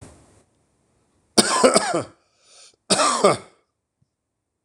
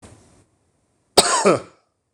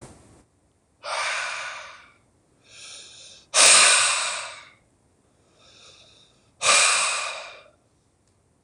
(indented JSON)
{
  "three_cough_length": "4.6 s",
  "three_cough_amplitude": 26028,
  "three_cough_signal_mean_std_ratio": 0.36,
  "cough_length": "2.1 s",
  "cough_amplitude": 26028,
  "cough_signal_mean_std_ratio": 0.33,
  "exhalation_length": "8.6 s",
  "exhalation_amplitude": 26028,
  "exhalation_signal_mean_std_ratio": 0.39,
  "survey_phase": "beta (2021-08-13 to 2022-03-07)",
  "age": "45-64",
  "gender": "Male",
  "wearing_mask": "No",
  "symptom_cough_any": true,
  "symptom_runny_or_blocked_nose": true,
  "symptom_shortness_of_breath": true,
  "symptom_fatigue": true,
  "smoker_status": "Never smoked",
  "respiratory_condition_asthma": true,
  "respiratory_condition_other": false,
  "recruitment_source": "Test and Trace",
  "submission_delay": "2 days",
  "covid_test_result": "Positive",
  "covid_test_method": "RT-qPCR"
}